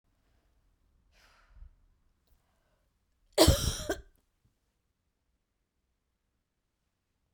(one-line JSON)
{"cough_length": "7.3 s", "cough_amplitude": 13956, "cough_signal_mean_std_ratio": 0.18, "survey_phase": "beta (2021-08-13 to 2022-03-07)", "age": "45-64", "gender": "Female", "wearing_mask": "No", "symptom_new_continuous_cough": true, "symptom_runny_or_blocked_nose": true, "symptom_sore_throat": true, "symptom_fatigue": true, "symptom_headache": true, "symptom_change_to_sense_of_smell_or_taste": true, "symptom_onset": "4 days", "smoker_status": "Never smoked", "respiratory_condition_asthma": false, "respiratory_condition_other": false, "recruitment_source": "Test and Trace", "submission_delay": "2 days", "covid_test_result": "Positive", "covid_test_method": "RT-qPCR", "covid_ct_value": 23.2, "covid_ct_gene": "ORF1ab gene"}